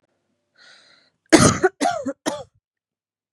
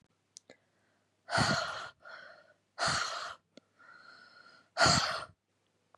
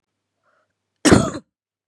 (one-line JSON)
{"three_cough_length": "3.3 s", "three_cough_amplitude": 32767, "three_cough_signal_mean_std_ratio": 0.31, "exhalation_length": "6.0 s", "exhalation_amplitude": 7824, "exhalation_signal_mean_std_ratio": 0.39, "cough_length": "1.9 s", "cough_amplitude": 32767, "cough_signal_mean_std_ratio": 0.27, "survey_phase": "beta (2021-08-13 to 2022-03-07)", "age": "18-44", "gender": "Female", "wearing_mask": "No", "symptom_cough_any": true, "symptom_new_continuous_cough": true, "symptom_runny_or_blocked_nose": true, "symptom_sore_throat": true, "symptom_onset": "37 days", "smoker_status": "Never smoked", "respiratory_condition_asthma": true, "respiratory_condition_other": false, "recruitment_source": "Test and Trace", "submission_delay": "31 days", "covid_test_result": "Negative", "covid_test_method": "RT-qPCR"}